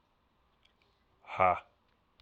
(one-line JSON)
{"exhalation_length": "2.2 s", "exhalation_amplitude": 9157, "exhalation_signal_mean_std_ratio": 0.24, "survey_phase": "alpha (2021-03-01 to 2021-08-12)", "age": "18-44", "gender": "Male", "wearing_mask": "No", "symptom_cough_any": true, "symptom_fatigue": true, "symptom_fever_high_temperature": true, "symptom_headache": true, "smoker_status": "Never smoked", "respiratory_condition_asthma": false, "respiratory_condition_other": false, "recruitment_source": "Test and Trace", "submission_delay": "2 days", "covid_test_result": "Positive", "covid_test_method": "RT-qPCR", "covid_ct_value": 20.7, "covid_ct_gene": "N gene"}